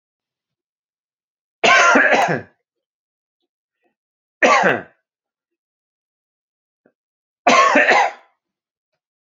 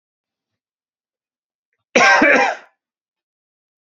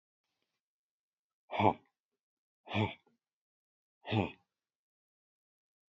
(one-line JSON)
{"three_cough_length": "9.4 s", "three_cough_amplitude": 28506, "three_cough_signal_mean_std_ratio": 0.35, "cough_length": "3.8 s", "cough_amplitude": 29411, "cough_signal_mean_std_ratio": 0.32, "exhalation_length": "5.9 s", "exhalation_amplitude": 7608, "exhalation_signal_mean_std_ratio": 0.23, "survey_phase": "beta (2021-08-13 to 2022-03-07)", "age": "45-64", "gender": "Male", "wearing_mask": "No", "symptom_none": true, "smoker_status": "Ex-smoker", "respiratory_condition_asthma": false, "respiratory_condition_other": false, "recruitment_source": "REACT", "submission_delay": "2 days", "covid_test_result": "Negative", "covid_test_method": "RT-qPCR", "influenza_a_test_result": "Unknown/Void", "influenza_b_test_result": "Unknown/Void"}